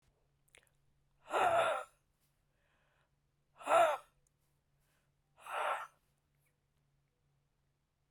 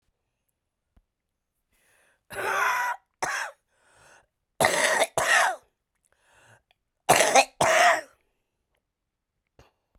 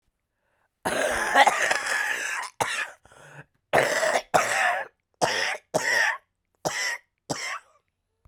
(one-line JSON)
{"exhalation_length": "8.1 s", "exhalation_amplitude": 4493, "exhalation_signal_mean_std_ratio": 0.3, "three_cough_length": "10.0 s", "three_cough_amplitude": 24639, "three_cough_signal_mean_std_ratio": 0.38, "cough_length": "8.3 s", "cough_amplitude": 22804, "cough_signal_mean_std_ratio": 0.57, "survey_phase": "beta (2021-08-13 to 2022-03-07)", "age": "45-64", "gender": "Female", "wearing_mask": "No", "symptom_cough_any": true, "symptom_runny_or_blocked_nose": true, "symptom_shortness_of_breath": true, "symptom_sore_throat": true, "symptom_abdominal_pain": true, "symptom_diarrhoea": true, "symptom_fatigue": true, "symptom_fever_high_temperature": true, "symptom_headache": true, "symptom_change_to_sense_of_smell_or_taste": true, "symptom_loss_of_taste": true, "symptom_onset": "3 days", "smoker_status": "Ex-smoker", "respiratory_condition_asthma": true, "respiratory_condition_other": false, "recruitment_source": "Test and Trace", "submission_delay": "1 day", "covid_test_result": "Positive", "covid_test_method": "RT-qPCR"}